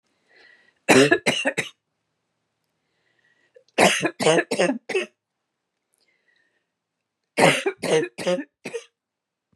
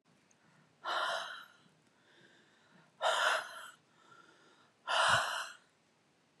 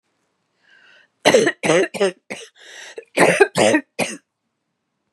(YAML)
three_cough_length: 9.6 s
three_cough_amplitude: 29781
three_cough_signal_mean_std_ratio: 0.36
exhalation_length: 6.4 s
exhalation_amplitude: 4640
exhalation_signal_mean_std_ratio: 0.42
cough_length: 5.1 s
cough_amplitude: 32768
cough_signal_mean_std_ratio: 0.4
survey_phase: beta (2021-08-13 to 2022-03-07)
age: 45-64
gender: Female
wearing_mask: 'No'
symptom_none: true
smoker_status: Never smoked
respiratory_condition_asthma: true
respiratory_condition_other: false
recruitment_source: REACT
submission_delay: 3 days
covid_test_result: Negative
covid_test_method: RT-qPCR
influenza_a_test_result: Unknown/Void
influenza_b_test_result: Unknown/Void